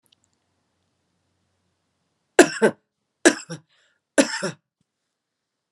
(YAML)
three_cough_length: 5.7 s
three_cough_amplitude: 32767
three_cough_signal_mean_std_ratio: 0.2
survey_phase: beta (2021-08-13 to 2022-03-07)
age: 18-44
gender: Female
wearing_mask: 'Yes'
symptom_fatigue: true
symptom_headache: true
symptom_change_to_sense_of_smell_or_taste: true
symptom_loss_of_taste: true
symptom_onset: 3 days
smoker_status: Never smoked
respiratory_condition_asthma: true
respiratory_condition_other: false
recruitment_source: Test and Trace
submission_delay: 2 days
covid_test_result: Positive
covid_test_method: RT-qPCR
covid_ct_value: 17.5
covid_ct_gene: N gene
covid_ct_mean: 17.8
covid_viral_load: 1500000 copies/ml
covid_viral_load_category: High viral load (>1M copies/ml)